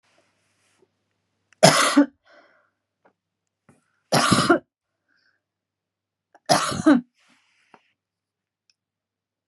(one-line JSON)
{"three_cough_length": "9.5 s", "three_cough_amplitude": 32767, "three_cough_signal_mean_std_ratio": 0.28, "survey_phase": "beta (2021-08-13 to 2022-03-07)", "age": "45-64", "gender": "Female", "wearing_mask": "No", "symptom_none": true, "smoker_status": "Never smoked", "respiratory_condition_asthma": false, "respiratory_condition_other": false, "recruitment_source": "REACT", "submission_delay": "1 day", "covid_test_result": "Negative", "covid_test_method": "RT-qPCR", "influenza_a_test_result": "Negative", "influenza_b_test_result": "Negative"}